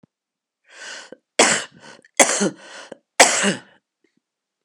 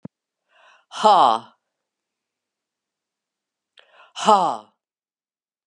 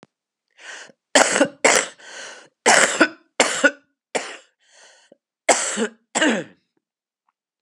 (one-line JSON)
{"three_cough_length": "4.6 s", "three_cough_amplitude": 32768, "three_cough_signal_mean_std_ratio": 0.33, "exhalation_length": "5.7 s", "exhalation_amplitude": 30551, "exhalation_signal_mean_std_ratio": 0.27, "cough_length": "7.6 s", "cough_amplitude": 32767, "cough_signal_mean_std_ratio": 0.38, "survey_phase": "beta (2021-08-13 to 2022-03-07)", "age": "65+", "gender": "Female", "wearing_mask": "No", "symptom_cough_any": true, "symptom_runny_or_blocked_nose": true, "symptom_sore_throat": true, "symptom_fatigue": true, "symptom_onset": "5 days", "smoker_status": "Ex-smoker", "respiratory_condition_asthma": false, "respiratory_condition_other": false, "recruitment_source": "Test and Trace", "submission_delay": "1 day", "covid_test_result": "Positive", "covid_test_method": "RT-qPCR", "covid_ct_value": 13.6, "covid_ct_gene": "ORF1ab gene", "covid_ct_mean": 14.3, "covid_viral_load": "21000000 copies/ml", "covid_viral_load_category": "High viral load (>1M copies/ml)"}